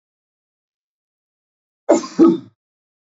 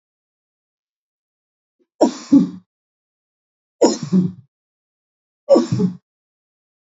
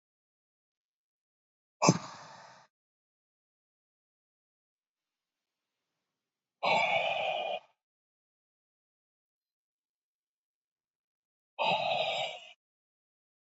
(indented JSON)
{
  "cough_length": "3.2 s",
  "cough_amplitude": 27149,
  "cough_signal_mean_std_ratio": 0.25,
  "three_cough_length": "6.9 s",
  "three_cough_amplitude": 27038,
  "three_cough_signal_mean_std_ratio": 0.3,
  "exhalation_length": "13.5 s",
  "exhalation_amplitude": 15519,
  "exhalation_signal_mean_std_ratio": 0.29,
  "survey_phase": "beta (2021-08-13 to 2022-03-07)",
  "age": "45-64",
  "gender": "Male",
  "wearing_mask": "No",
  "symptom_none": true,
  "smoker_status": "Never smoked",
  "respiratory_condition_asthma": false,
  "respiratory_condition_other": false,
  "recruitment_source": "REACT",
  "submission_delay": "2 days",
  "covid_test_result": "Negative",
  "covid_test_method": "RT-qPCR",
  "influenza_a_test_result": "Negative",
  "influenza_b_test_result": "Negative"
}